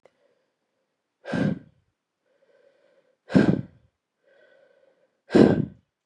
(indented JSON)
{
  "exhalation_length": "6.1 s",
  "exhalation_amplitude": 31604,
  "exhalation_signal_mean_std_ratio": 0.26,
  "survey_phase": "beta (2021-08-13 to 2022-03-07)",
  "age": "18-44",
  "gender": "Female",
  "wearing_mask": "No",
  "symptom_cough_any": true,
  "symptom_runny_or_blocked_nose": true,
  "symptom_shortness_of_breath": true,
  "symptom_sore_throat": true,
  "symptom_headache": true,
  "smoker_status": "Never smoked",
  "respiratory_condition_asthma": false,
  "respiratory_condition_other": false,
  "recruitment_source": "Test and Trace",
  "submission_delay": "2 days",
  "covid_test_result": "Positive",
  "covid_test_method": "LFT"
}